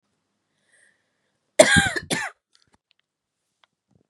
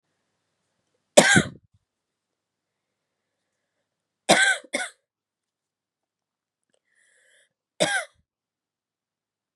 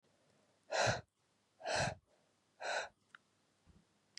{"cough_length": "4.1 s", "cough_amplitude": 32768, "cough_signal_mean_std_ratio": 0.23, "three_cough_length": "9.6 s", "three_cough_amplitude": 32768, "three_cough_signal_mean_std_ratio": 0.21, "exhalation_length": "4.2 s", "exhalation_amplitude": 2924, "exhalation_signal_mean_std_ratio": 0.37, "survey_phase": "beta (2021-08-13 to 2022-03-07)", "age": "18-44", "gender": "Female", "wearing_mask": "No", "symptom_cough_any": true, "symptom_runny_or_blocked_nose": true, "symptom_sore_throat": true, "symptom_fatigue": true, "symptom_headache": true, "symptom_change_to_sense_of_smell_or_taste": true, "symptom_onset": "3 days", "smoker_status": "Never smoked", "respiratory_condition_asthma": false, "respiratory_condition_other": false, "recruitment_source": "Test and Trace", "submission_delay": "2 days", "covid_test_result": "Positive", "covid_test_method": "RT-qPCR", "covid_ct_value": 16.6, "covid_ct_gene": "ORF1ab gene", "covid_ct_mean": 16.7, "covid_viral_load": "3200000 copies/ml", "covid_viral_load_category": "High viral load (>1M copies/ml)"}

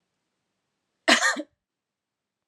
{"cough_length": "2.5 s", "cough_amplitude": 21682, "cough_signal_mean_std_ratio": 0.26, "survey_phase": "alpha (2021-03-01 to 2021-08-12)", "age": "18-44", "gender": "Female", "wearing_mask": "No", "symptom_cough_any": true, "symptom_shortness_of_breath": true, "symptom_headache": true, "symptom_onset": "2 days", "smoker_status": "Never smoked", "respiratory_condition_asthma": false, "respiratory_condition_other": false, "recruitment_source": "Test and Trace", "submission_delay": "1 day", "covid_ct_value": 28.4, "covid_ct_gene": "ORF1ab gene"}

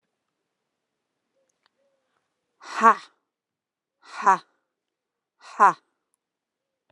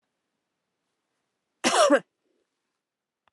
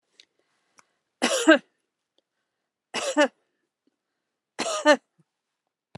{"exhalation_length": "6.9 s", "exhalation_amplitude": 26899, "exhalation_signal_mean_std_ratio": 0.19, "cough_length": "3.3 s", "cough_amplitude": 15554, "cough_signal_mean_std_ratio": 0.25, "three_cough_length": "6.0 s", "three_cough_amplitude": 25914, "three_cough_signal_mean_std_ratio": 0.26, "survey_phase": "beta (2021-08-13 to 2022-03-07)", "age": "65+", "gender": "Female", "wearing_mask": "No", "symptom_none": true, "smoker_status": "Ex-smoker", "respiratory_condition_asthma": false, "respiratory_condition_other": false, "recruitment_source": "REACT", "submission_delay": "5 days", "covid_test_result": "Negative", "covid_test_method": "RT-qPCR"}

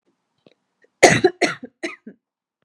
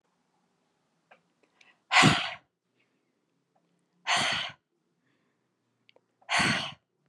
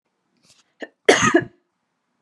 {"three_cough_length": "2.6 s", "three_cough_amplitude": 32768, "three_cough_signal_mean_std_ratio": 0.27, "exhalation_length": "7.1 s", "exhalation_amplitude": 17248, "exhalation_signal_mean_std_ratio": 0.3, "cough_length": "2.2 s", "cough_amplitude": 32426, "cough_signal_mean_std_ratio": 0.29, "survey_phase": "beta (2021-08-13 to 2022-03-07)", "age": "18-44", "gender": "Female", "wearing_mask": "No", "symptom_none": true, "smoker_status": "Never smoked", "respiratory_condition_asthma": false, "respiratory_condition_other": false, "recruitment_source": "REACT", "submission_delay": "3 days", "covid_test_result": "Negative", "covid_test_method": "RT-qPCR", "covid_ct_value": 40.0, "covid_ct_gene": "N gene"}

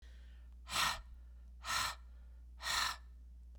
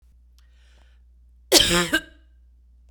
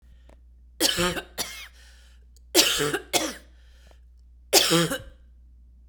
{"exhalation_length": "3.6 s", "exhalation_amplitude": 2481, "exhalation_signal_mean_std_ratio": 0.64, "cough_length": "2.9 s", "cough_amplitude": 32767, "cough_signal_mean_std_ratio": 0.32, "three_cough_length": "5.9 s", "three_cough_amplitude": 25411, "three_cough_signal_mean_std_ratio": 0.43, "survey_phase": "beta (2021-08-13 to 2022-03-07)", "age": "45-64", "gender": "Female", "wearing_mask": "No", "symptom_cough_any": true, "symptom_new_continuous_cough": true, "symptom_runny_or_blocked_nose": true, "symptom_shortness_of_breath": true, "symptom_fatigue": true, "symptom_headache": true, "symptom_onset": "4 days", "smoker_status": "Never smoked", "respiratory_condition_asthma": false, "respiratory_condition_other": false, "recruitment_source": "Test and Trace", "submission_delay": "1 day", "covid_test_result": "Positive", "covid_test_method": "RT-qPCR", "covid_ct_value": 21.4, "covid_ct_gene": "N gene"}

